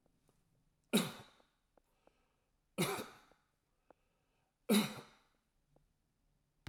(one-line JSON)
{"three_cough_length": "6.7 s", "three_cough_amplitude": 4134, "three_cough_signal_mean_std_ratio": 0.25, "survey_phase": "alpha (2021-03-01 to 2021-08-12)", "age": "65+", "gender": "Male", "wearing_mask": "No", "symptom_none": true, "smoker_status": "Ex-smoker", "respiratory_condition_asthma": false, "respiratory_condition_other": false, "recruitment_source": "REACT", "submission_delay": "2 days", "covid_test_result": "Negative", "covid_test_method": "RT-qPCR"}